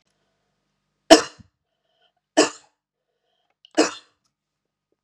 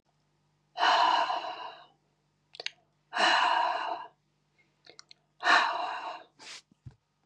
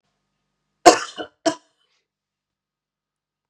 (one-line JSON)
{"three_cough_length": "5.0 s", "three_cough_amplitude": 32768, "three_cough_signal_mean_std_ratio": 0.18, "exhalation_length": "7.3 s", "exhalation_amplitude": 11306, "exhalation_signal_mean_std_ratio": 0.46, "cough_length": "3.5 s", "cough_amplitude": 32768, "cough_signal_mean_std_ratio": 0.17, "survey_phase": "beta (2021-08-13 to 2022-03-07)", "age": "45-64", "gender": "Female", "wearing_mask": "No", "symptom_none": true, "symptom_onset": "10 days", "smoker_status": "Never smoked", "respiratory_condition_asthma": false, "respiratory_condition_other": false, "recruitment_source": "REACT", "submission_delay": "1 day", "covid_test_result": "Negative", "covid_test_method": "RT-qPCR", "influenza_a_test_result": "Negative", "influenza_b_test_result": "Negative"}